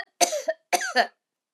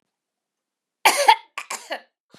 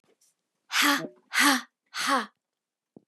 {"three_cough_length": "1.5 s", "three_cough_amplitude": 22271, "three_cough_signal_mean_std_ratio": 0.44, "cough_length": "2.4 s", "cough_amplitude": 30937, "cough_signal_mean_std_ratio": 0.28, "exhalation_length": "3.1 s", "exhalation_amplitude": 13629, "exhalation_signal_mean_std_ratio": 0.42, "survey_phase": "beta (2021-08-13 to 2022-03-07)", "age": "45-64", "gender": "Female", "wearing_mask": "Yes", "symptom_none": true, "smoker_status": "Never smoked", "respiratory_condition_asthma": true, "respiratory_condition_other": false, "recruitment_source": "REACT", "submission_delay": "-1 day", "covid_test_result": "Negative", "covid_test_method": "RT-qPCR", "influenza_a_test_result": "Negative", "influenza_b_test_result": "Negative"}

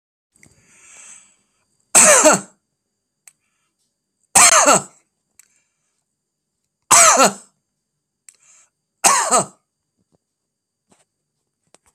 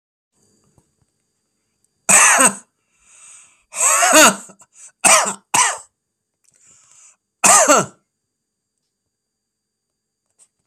{"three_cough_length": "11.9 s", "three_cough_amplitude": 32768, "three_cough_signal_mean_std_ratio": 0.3, "cough_length": "10.7 s", "cough_amplitude": 32768, "cough_signal_mean_std_ratio": 0.34, "survey_phase": "beta (2021-08-13 to 2022-03-07)", "age": "65+", "gender": "Male", "wearing_mask": "No", "symptom_none": true, "smoker_status": "Never smoked", "respiratory_condition_asthma": false, "respiratory_condition_other": false, "recruitment_source": "REACT", "submission_delay": "2 days", "covid_test_result": "Negative", "covid_test_method": "RT-qPCR", "influenza_a_test_result": "Negative", "influenza_b_test_result": "Negative"}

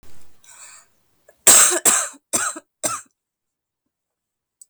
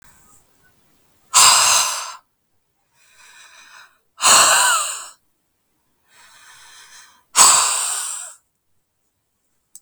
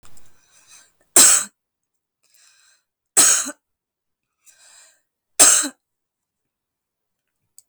{"cough_length": "4.7 s", "cough_amplitude": 32768, "cough_signal_mean_std_ratio": 0.33, "exhalation_length": "9.8 s", "exhalation_amplitude": 32768, "exhalation_signal_mean_std_ratio": 0.37, "three_cough_length": "7.7 s", "three_cough_amplitude": 32768, "three_cough_signal_mean_std_ratio": 0.26, "survey_phase": "beta (2021-08-13 to 2022-03-07)", "age": "18-44", "gender": "Female", "wearing_mask": "No", "symptom_cough_any": true, "symptom_shortness_of_breath": true, "symptom_fatigue": true, "symptom_headache": true, "symptom_onset": "4 days", "smoker_status": "Ex-smoker", "respiratory_condition_asthma": true, "respiratory_condition_other": false, "recruitment_source": "Test and Trace", "submission_delay": "1 day", "covid_test_result": "Positive", "covid_test_method": "RT-qPCR", "covid_ct_value": 21.4, "covid_ct_gene": "N gene"}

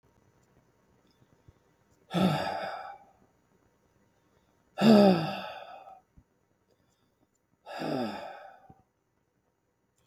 {"exhalation_length": "10.1 s", "exhalation_amplitude": 14732, "exhalation_signal_mean_std_ratio": 0.29, "survey_phase": "beta (2021-08-13 to 2022-03-07)", "age": "65+", "gender": "Male", "wearing_mask": "No", "symptom_none": true, "smoker_status": "Never smoked", "respiratory_condition_asthma": false, "respiratory_condition_other": false, "recruitment_source": "REACT", "submission_delay": "1 day", "covid_test_result": "Negative", "covid_test_method": "RT-qPCR"}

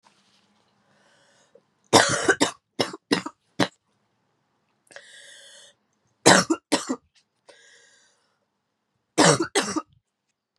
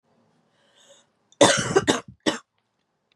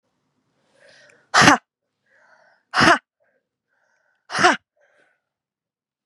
{"three_cough_length": "10.6 s", "three_cough_amplitude": 32767, "three_cough_signal_mean_std_ratio": 0.28, "cough_length": "3.2 s", "cough_amplitude": 28315, "cough_signal_mean_std_ratio": 0.31, "exhalation_length": "6.1 s", "exhalation_amplitude": 32768, "exhalation_signal_mean_std_ratio": 0.25, "survey_phase": "beta (2021-08-13 to 2022-03-07)", "age": "18-44", "gender": "Female", "wearing_mask": "No", "symptom_cough_any": true, "symptom_new_continuous_cough": true, "symptom_runny_or_blocked_nose": true, "symptom_shortness_of_breath": true, "symptom_sore_throat": true, "symptom_fatigue": true, "symptom_fever_high_temperature": true, "symptom_headache": true, "symptom_loss_of_taste": true, "symptom_other": true, "symptom_onset": "3 days", "smoker_status": "Never smoked", "respiratory_condition_asthma": true, "respiratory_condition_other": false, "recruitment_source": "Test and Trace", "submission_delay": "1 day", "covid_test_result": "Positive", "covid_test_method": "ePCR"}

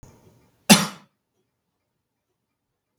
{"cough_length": "3.0 s", "cough_amplitude": 32768, "cough_signal_mean_std_ratio": 0.16, "survey_phase": "beta (2021-08-13 to 2022-03-07)", "age": "65+", "gender": "Male", "wearing_mask": "No", "symptom_cough_any": true, "smoker_status": "Never smoked", "respiratory_condition_asthma": false, "respiratory_condition_other": false, "recruitment_source": "REACT", "submission_delay": "2 days", "covid_test_result": "Negative", "covid_test_method": "RT-qPCR", "influenza_a_test_result": "Negative", "influenza_b_test_result": "Negative"}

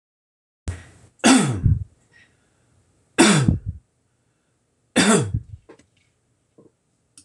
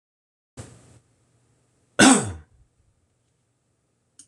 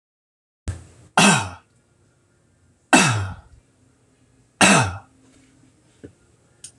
{"three_cough_length": "7.2 s", "three_cough_amplitude": 25724, "three_cough_signal_mean_std_ratio": 0.35, "cough_length": "4.3 s", "cough_amplitude": 26027, "cough_signal_mean_std_ratio": 0.21, "exhalation_length": "6.8 s", "exhalation_amplitude": 26028, "exhalation_signal_mean_std_ratio": 0.31, "survey_phase": "beta (2021-08-13 to 2022-03-07)", "age": "65+", "gender": "Male", "wearing_mask": "No", "symptom_none": true, "smoker_status": "Never smoked", "respiratory_condition_asthma": false, "respiratory_condition_other": false, "recruitment_source": "REACT", "submission_delay": "1 day", "covid_test_result": "Negative", "covid_test_method": "RT-qPCR"}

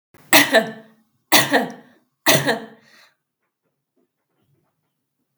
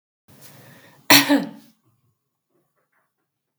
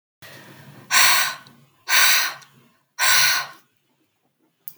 {"three_cough_length": "5.4 s", "three_cough_amplitude": 32768, "three_cough_signal_mean_std_ratio": 0.32, "cough_length": "3.6 s", "cough_amplitude": 32768, "cough_signal_mean_std_ratio": 0.23, "exhalation_length": "4.8 s", "exhalation_amplitude": 32768, "exhalation_signal_mean_std_ratio": 0.45, "survey_phase": "beta (2021-08-13 to 2022-03-07)", "age": "45-64", "gender": "Female", "wearing_mask": "No", "symptom_cough_any": true, "symptom_onset": "12 days", "smoker_status": "Never smoked", "respiratory_condition_asthma": false, "respiratory_condition_other": false, "recruitment_source": "REACT", "submission_delay": "1 day", "covid_test_result": "Negative", "covid_test_method": "RT-qPCR"}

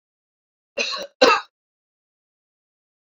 {"cough_length": "3.2 s", "cough_amplitude": 29244, "cough_signal_mean_std_ratio": 0.24, "survey_phase": "beta (2021-08-13 to 2022-03-07)", "age": "45-64", "gender": "Male", "wearing_mask": "No", "symptom_cough_any": true, "symptom_runny_or_blocked_nose": true, "symptom_sore_throat": true, "smoker_status": "Never smoked", "respiratory_condition_asthma": false, "respiratory_condition_other": false, "recruitment_source": "REACT", "submission_delay": "1 day", "covid_test_result": "Negative", "covid_test_method": "RT-qPCR"}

